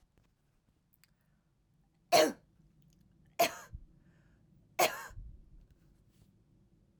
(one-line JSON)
{"three_cough_length": "7.0 s", "three_cough_amplitude": 9552, "three_cough_signal_mean_std_ratio": 0.23, "survey_phase": "beta (2021-08-13 to 2022-03-07)", "age": "18-44", "gender": "Female", "wearing_mask": "No", "symptom_runny_or_blocked_nose": true, "symptom_fatigue": true, "symptom_fever_high_temperature": true, "symptom_headache": true, "smoker_status": "Never smoked", "respiratory_condition_asthma": false, "respiratory_condition_other": false, "recruitment_source": "Test and Trace", "submission_delay": "2 days", "covid_test_result": "Positive", "covid_test_method": "RT-qPCR", "covid_ct_value": 24.0, "covid_ct_gene": "ORF1ab gene"}